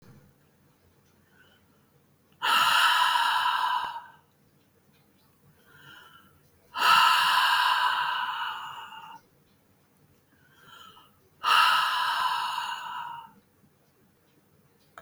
{"exhalation_length": "15.0 s", "exhalation_amplitude": 14315, "exhalation_signal_mean_std_ratio": 0.49, "survey_phase": "beta (2021-08-13 to 2022-03-07)", "age": "45-64", "gender": "Female", "wearing_mask": "No", "symptom_none": true, "smoker_status": "Never smoked", "respiratory_condition_asthma": false, "respiratory_condition_other": false, "recruitment_source": "REACT", "submission_delay": "2 days", "covid_test_result": "Negative", "covid_test_method": "RT-qPCR"}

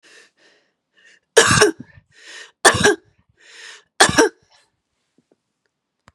{"three_cough_length": "6.1 s", "three_cough_amplitude": 32768, "three_cough_signal_mean_std_ratio": 0.3, "survey_phase": "beta (2021-08-13 to 2022-03-07)", "age": "45-64", "gender": "Female", "wearing_mask": "No", "symptom_none": true, "smoker_status": "Never smoked", "respiratory_condition_asthma": false, "respiratory_condition_other": false, "recruitment_source": "REACT", "submission_delay": "1 day", "covid_test_result": "Negative", "covid_test_method": "RT-qPCR", "influenza_a_test_result": "Negative", "influenza_b_test_result": "Negative"}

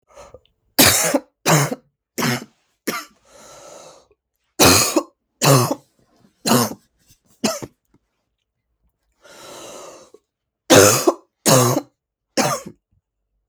{"three_cough_length": "13.5 s", "three_cough_amplitude": 32768, "three_cough_signal_mean_std_ratio": 0.37, "survey_phase": "beta (2021-08-13 to 2022-03-07)", "age": "45-64", "gender": "Female", "wearing_mask": "No", "symptom_cough_any": true, "symptom_runny_or_blocked_nose": true, "symptom_shortness_of_breath": true, "symptom_sore_throat": true, "symptom_fatigue": true, "symptom_headache": true, "symptom_other": true, "symptom_onset": "3 days", "smoker_status": "Never smoked", "respiratory_condition_asthma": false, "respiratory_condition_other": false, "recruitment_source": "Test and Trace", "submission_delay": "2 days", "covid_test_result": "Positive", "covid_test_method": "ePCR"}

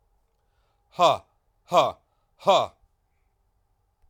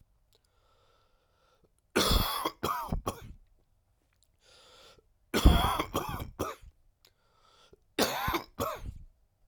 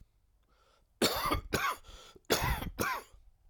{"exhalation_length": "4.1 s", "exhalation_amplitude": 19204, "exhalation_signal_mean_std_ratio": 0.28, "three_cough_length": "9.5 s", "three_cough_amplitude": 15444, "three_cough_signal_mean_std_ratio": 0.37, "cough_length": "3.5 s", "cough_amplitude": 7680, "cough_signal_mean_std_ratio": 0.51, "survey_phase": "alpha (2021-03-01 to 2021-08-12)", "age": "45-64", "gender": "Male", "wearing_mask": "No", "symptom_cough_any": true, "symptom_fatigue": true, "symptom_fever_high_temperature": true, "symptom_change_to_sense_of_smell_or_taste": true, "symptom_loss_of_taste": true, "symptom_onset": "3 days", "smoker_status": "Ex-smoker", "respiratory_condition_asthma": false, "respiratory_condition_other": false, "recruitment_source": "Test and Trace", "submission_delay": "2 days", "covid_test_result": "Positive", "covid_test_method": "RT-qPCR", "covid_ct_value": 24.5, "covid_ct_gene": "ORF1ab gene", "covid_ct_mean": 25.1, "covid_viral_load": "5800 copies/ml", "covid_viral_load_category": "Minimal viral load (< 10K copies/ml)"}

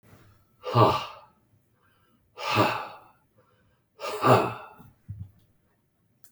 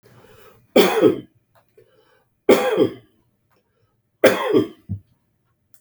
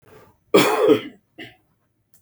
{"exhalation_length": "6.3 s", "exhalation_amplitude": 18895, "exhalation_signal_mean_std_ratio": 0.34, "three_cough_length": "5.8 s", "three_cough_amplitude": 32768, "three_cough_signal_mean_std_ratio": 0.36, "cough_length": "2.2 s", "cough_amplitude": 26682, "cough_signal_mean_std_ratio": 0.38, "survey_phase": "beta (2021-08-13 to 2022-03-07)", "age": "65+", "gender": "Male", "wearing_mask": "No", "symptom_cough_any": true, "symptom_onset": "12 days", "smoker_status": "Never smoked", "respiratory_condition_asthma": false, "respiratory_condition_other": false, "recruitment_source": "REACT", "submission_delay": "1 day", "covid_test_result": "Negative", "covid_test_method": "RT-qPCR", "influenza_a_test_result": "Negative", "influenza_b_test_result": "Negative"}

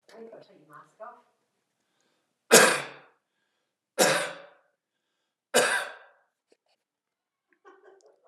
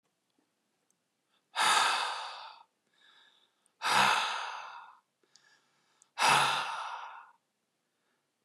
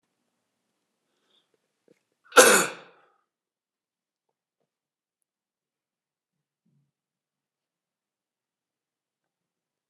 {"three_cough_length": "8.3 s", "three_cough_amplitude": 30539, "three_cough_signal_mean_std_ratio": 0.25, "exhalation_length": "8.4 s", "exhalation_amplitude": 8021, "exhalation_signal_mean_std_ratio": 0.41, "cough_length": "9.9 s", "cough_amplitude": 30450, "cough_signal_mean_std_ratio": 0.13, "survey_phase": "alpha (2021-03-01 to 2021-08-12)", "age": "18-44", "gender": "Male", "wearing_mask": "Yes", "symptom_none": true, "smoker_status": "Never smoked", "respiratory_condition_asthma": false, "respiratory_condition_other": false, "recruitment_source": "Test and Trace", "submission_delay": "0 days", "covid_test_result": "Negative", "covid_test_method": "LFT"}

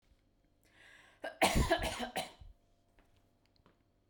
{"cough_length": "4.1 s", "cough_amplitude": 5936, "cough_signal_mean_std_ratio": 0.35, "survey_phase": "beta (2021-08-13 to 2022-03-07)", "age": "18-44", "gender": "Female", "wearing_mask": "No", "symptom_none": true, "symptom_onset": "12 days", "smoker_status": "Never smoked", "respiratory_condition_asthma": false, "respiratory_condition_other": false, "recruitment_source": "REACT", "submission_delay": "3 days", "covid_test_result": "Negative", "covid_test_method": "RT-qPCR", "influenza_a_test_result": "Unknown/Void", "influenza_b_test_result": "Unknown/Void"}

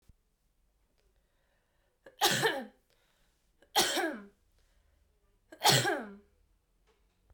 {"three_cough_length": "7.3 s", "three_cough_amplitude": 10190, "three_cough_signal_mean_std_ratio": 0.32, "survey_phase": "beta (2021-08-13 to 2022-03-07)", "age": "18-44", "gender": "Female", "wearing_mask": "No", "symptom_cough_any": true, "symptom_runny_or_blocked_nose": true, "symptom_fatigue": true, "smoker_status": "Never smoked", "respiratory_condition_asthma": false, "respiratory_condition_other": false, "recruitment_source": "Test and Trace", "submission_delay": "2 days", "covid_test_result": "Positive", "covid_test_method": "RT-qPCR", "covid_ct_value": 20.4, "covid_ct_gene": "ORF1ab gene"}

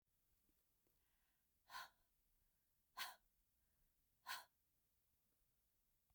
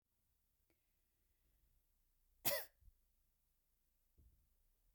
{"exhalation_length": "6.1 s", "exhalation_amplitude": 491, "exhalation_signal_mean_std_ratio": 0.28, "cough_length": "4.9 s", "cough_amplitude": 2247, "cough_signal_mean_std_ratio": 0.18, "survey_phase": "beta (2021-08-13 to 2022-03-07)", "age": "65+", "gender": "Female", "wearing_mask": "No", "symptom_none": true, "smoker_status": "Never smoked", "respiratory_condition_asthma": false, "respiratory_condition_other": false, "recruitment_source": "REACT", "submission_delay": "1 day", "covid_test_result": "Negative", "covid_test_method": "RT-qPCR"}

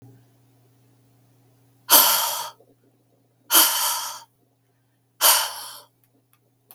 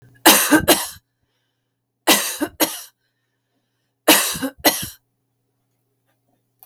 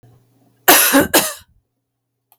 {"exhalation_length": "6.7 s", "exhalation_amplitude": 32768, "exhalation_signal_mean_std_ratio": 0.35, "three_cough_length": "6.7 s", "three_cough_amplitude": 32766, "three_cough_signal_mean_std_ratio": 0.35, "cough_length": "2.4 s", "cough_amplitude": 32768, "cough_signal_mean_std_ratio": 0.4, "survey_phase": "beta (2021-08-13 to 2022-03-07)", "age": "45-64", "gender": "Female", "wearing_mask": "No", "symptom_none": true, "symptom_onset": "2 days", "smoker_status": "Ex-smoker", "respiratory_condition_asthma": false, "respiratory_condition_other": false, "recruitment_source": "REACT", "submission_delay": "2 days", "covid_test_result": "Negative", "covid_test_method": "RT-qPCR", "influenza_a_test_result": "Negative", "influenza_b_test_result": "Negative"}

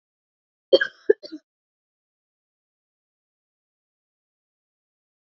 {"cough_length": "5.3 s", "cough_amplitude": 26615, "cough_signal_mean_std_ratio": 0.12, "survey_phase": "beta (2021-08-13 to 2022-03-07)", "age": "18-44", "gender": "Female", "wearing_mask": "No", "symptom_cough_any": true, "symptom_runny_or_blocked_nose": true, "symptom_sore_throat": true, "symptom_fatigue": true, "symptom_fever_high_temperature": true, "symptom_headache": true, "symptom_other": true, "smoker_status": "Never smoked", "respiratory_condition_asthma": false, "respiratory_condition_other": false, "recruitment_source": "Test and Trace", "submission_delay": "1 day", "covid_test_result": "Positive", "covid_test_method": "LFT"}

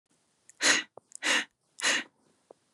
{"exhalation_length": "2.7 s", "exhalation_amplitude": 10157, "exhalation_signal_mean_std_ratio": 0.39, "survey_phase": "beta (2021-08-13 to 2022-03-07)", "age": "18-44", "gender": "Female", "wearing_mask": "No", "symptom_runny_or_blocked_nose": true, "smoker_status": "Never smoked", "respiratory_condition_asthma": false, "respiratory_condition_other": false, "recruitment_source": "Test and Trace", "submission_delay": "2 days", "covid_test_result": "Negative", "covid_test_method": "RT-qPCR"}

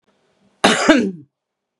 {"cough_length": "1.8 s", "cough_amplitude": 32768, "cough_signal_mean_std_ratio": 0.4, "survey_phase": "beta (2021-08-13 to 2022-03-07)", "age": "18-44", "gender": "Female", "wearing_mask": "No", "symptom_none": true, "smoker_status": "Current smoker (11 or more cigarettes per day)", "respiratory_condition_asthma": false, "respiratory_condition_other": false, "recruitment_source": "REACT", "submission_delay": "1 day", "covid_test_result": "Negative", "covid_test_method": "RT-qPCR"}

